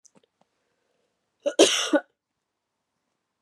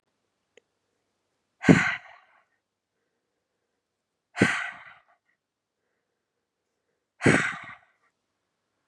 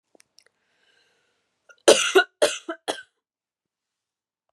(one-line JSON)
{"cough_length": "3.4 s", "cough_amplitude": 26534, "cough_signal_mean_std_ratio": 0.25, "exhalation_length": "8.9 s", "exhalation_amplitude": 27371, "exhalation_signal_mean_std_ratio": 0.22, "three_cough_length": "4.5 s", "three_cough_amplitude": 32039, "three_cough_signal_mean_std_ratio": 0.23, "survey_phase": "beta (2021-08-13 to 2022-03-07)", "age": "18-44", "gender": "Female", "wearing_mask": "No", "symptom_cough_any": true, "symptom_runny_or_blocked_nose": true, "symptom_sore_throat": true, "symptom_onset": "3 days", "smoker_status": "Never smoked", "respiratory_condition_asthma": false, "respiratory_condition_other": false, "recruitment_source": "Test and Trace", "submission_delay": "1 day", "covid_test_result": "Positive", "covid_test_method": "LAMP"}